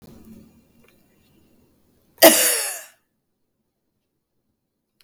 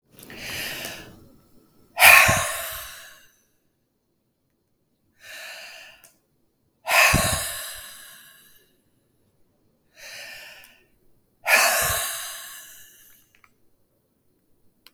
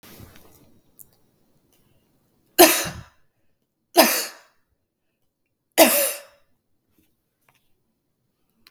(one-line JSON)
{"cough_length": "5.0 s", "cough_amplitude": 32768, "cough_signal_mean_std_ratio": 0.22, "exhalation_length": "14.9 s", "exhalation_amplitude": 32768, "exhalation_signal_mean_std_ratio": 0.31, "three_cough_length": "8.7 s", "three_cough_amplitude": 32768, "three_cough_signal_mean_std_ratio": 0.23, "survey_phase": "beta (2021-08-13 to 2022-03-07)", "age": "45-64", "gender": "Female", "wearing_mask": "No", "symptom_none": true, "smoker_status": "Ex-smoker", "respiratory_condition_asthma": false, "respiratory_condition_other": false, "recruitment_source": "REACT", "submission_delay": "9 days", "covid_test_result": "Negative", "covid_test_method": "RT-qPCR"}